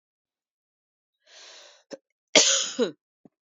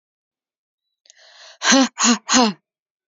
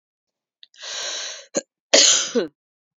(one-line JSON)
{"cough_length": "3.5 s", "cough_amplitude": 27568, "cough_signal_mean_std_ratio": 0.27, "exhalation_length": "3.1 s", "exhalation_amplitude": 30316, "exhalation_signal_mean_std_ratio": 0.37, "three_cough_length": "3.0 s", "three_cough_amplitude": 32767, "three_cough_signal_mean_std_ratio": 0.38, "survey_phase": "beta (2021-08-13 to 2022-03-07)", "age": "45-64", "gender": "Female", "wearing_mask": "No", "symptom_cough_any": true, "symptom_new_continuous_cough": true, "symptom_runny_or_blocked_nose": true, "symptom_shortness_of_breath": true, "symptom_sore_throat": true, "symptom_fatigue": true, "symptom_fever_high_temperature": true, "symptom_headache": true, "symptom_onset": "3 days", "smoker_status": "Ex-smoker", "respiratory_condition_asthma": false, "respiratory_condition_other": false, "recruitment_source": "Test and Trace", "submission_delay": "2 days", "covid_test_result": "Positive", "covid_test_method": "RT-qPCR", "covid_ct_value": 18.1, "covid_ct_gene": "ORF1ab gene"}